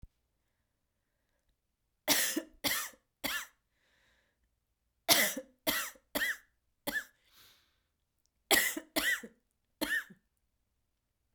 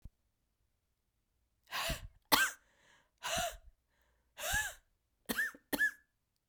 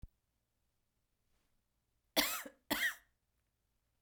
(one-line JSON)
{"three_cough_length": "11.3 s", "three_cough_amplitude": 10178, "three_cough_signal_mean_std_ratio": 0.34, "exhalation_length": "6.5 s", "exhalation_amplitude": 8458, "exhalation_signal_mean_std_ratio": 0.37, "cough_length": "4.0 s", "cough_amplitude": 7078, "cough_signal_mean_std_ratio": 0.27, "survey_phase": "beta (2021-08-13 to 2022-03-07)", "age": "45-64", "gender": "Female", "wearing_mask": "No", "symptom_cough_any": true, "symptom_new_continuous_cough": true, "symptom_shortness_of_breath": true, "symptom_fatigue": true, "symptom_headache": true, "symptom_onset": "4 days", "smoker_status": "Never smoked", "respiratory_condition_asthma": false, "respiratory_condition_other": false, "recruitment_source": "Test and Trace", "submission_delay": "2 days", "covid_test_result": "Positive", "covid_test_method": "ePCR"}